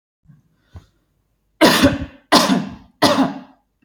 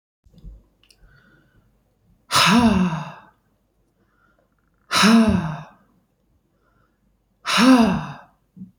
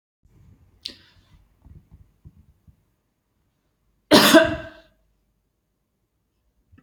{"three_cough_length": "3.8 s", "three_cough_amplitude": 32767, "three_cough_signal_mean_std_ratio": 0.42, "exhalation_length": "8.8 s", "exhalation_amplitude": 23984, "exhalation_signal_mean_std_ratio": 0.39, "cough_length": "6.8 s", "cough_amplitude": 32768, "cough_signal_mean_std_ratio": 0.2, "survey_phase": "beta (2021-08-13 to 2022-03-07)", "age": "18-44", "gender": "Female", "wearing_mask": "No", "symptom_runny_or_blocked_nose": true, "smoker_status": "Never smoked", "respiratory_condition_asthma": false, "respiratory_condition_other": false, "recruitment_source": "REACT", "submission_delay": "1 day", "covid_test_result": "Negative", "covid_test_method": "RT-qPCR"}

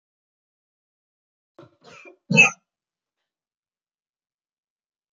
{"three_cough_length": "5.1 s", "three_cough_amplitude": 23374, "three_cough_signal_mean_std_ratio": 0.15, "survey_phase": "beta (2021-08-13 to 2022-03-07)", "age": "45-64", "gender": "Female", "wearing_mask": "No", "symptom_none": true, "smoker_status": "Never smoked", "respiratory_condition_asthma": true, "respiratory_condition_other": false, "recruitment_source": "REACT", "submission_delay": "3 days", "covid_test_result": "Negative", "covid_test_method": "RT-qPCR"}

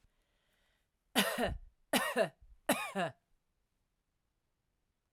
{"three_cough_length": "5.1 s", "three_cough_amplitude": 6790, "three_cough_signal_mean_std_ratio": 0.36, "survey_phase": "alpha (2021-03-01 to 2021-08-12)", "age": "45-64", "gender": "Female", "wearing_mask": "No", "symptom_none": true, "smoker_status": "Never smoked", "respiratory_condition_asthma": false, "respiratory_condition_other": false, "recruitment_source": "REACT", "submission_delay": "1 day", "covid_test_result": "Negative", "covid_test_method": "RT-qPCR"}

